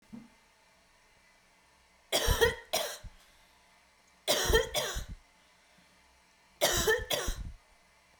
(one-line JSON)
{"three_cough_length": "8.2 s", "three_cough_amplitude": 8321, "three_cough_signal_mean_std_ratio": 0.42, "survey_phase": "beta (2021-08-13 to 2022-03-07)", "age": "18-44", "gender": "Female", "wearing_mask": "No", "symptom_cough_any": true, "symptom_new_continuous_cough": true, "symptom_onset": "4 days", "smoker_status": "Never smoked", "respiratory_condition_asthma": false, "respiratory_condition_other": false, "recruitment_source": "REACT", "submission_delay": "1 day", "covid_test_result": "Negative", "covid_test_method": "RT-qPCR"}